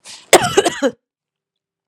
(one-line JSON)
{"cough_length": "1.9 s", "cough_amplitude": 32768, "cough_signal_mean_std_ratio": 0.34, "survey_phase": "alpha (2021-03-01 to 2021-08-12)", "age": "45-64", "gender": "Female", "wearing_mask": "No", "symptom_cough_any": true, "symptom_fatigue": true, "symptom_headache": true, "symptom_change_to_sense_of_smell_or_taste": true, "symptom_onset": "5 days", "smoker_status": "Never smoked", "respiratory_condition_asthma": false, "respiratory_condition_other": false, "recruitment_source": "Test and Trace", "submission_delay": "2 days", "covid_test_result": "Positive", "covid_test_method": "RT-qPCR", "covid_ct_value": 15.6, "covid_ct_gene": "N gene", "covid_ct_mean": 15.7, "covid_viral_load": "6900000 copies/ml", "covid_viral_load_category": "High viral load (>1M copies/ml)"}